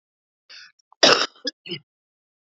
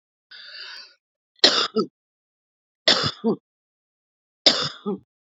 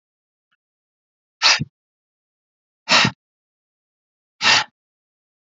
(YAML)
cough_length: 2.5 s
cough_amplitude: 31682
cough_signal_mean_std_ratio: 0.25
three_cough_length: 5.2 s
three_cough_amplitude: 32768
three_cough_signal_mean_std_ratio: 0.33
exhalation_length: 5.5 s
exhalation_amplitude: 31473
exhalation_signal_mean_std_ratio: 0.26
survey_phase: beta (2021-08-13 to 2022-03-07)
age: 45-64
gender: Female
wearing_mask: 'No'
symptom_none: true
smoker_status: Current smoker (1 to 10 cigarettes per day)
respiratory_condition_asthma: false
respiratory_condition_other: false
recruitment_source: REACT
submission_delay: 1 day
covid_test_result: Negative
covid_test_method: RT-qPCR
influenza_a_test_result: Negative
influenza_b_test_result: Negative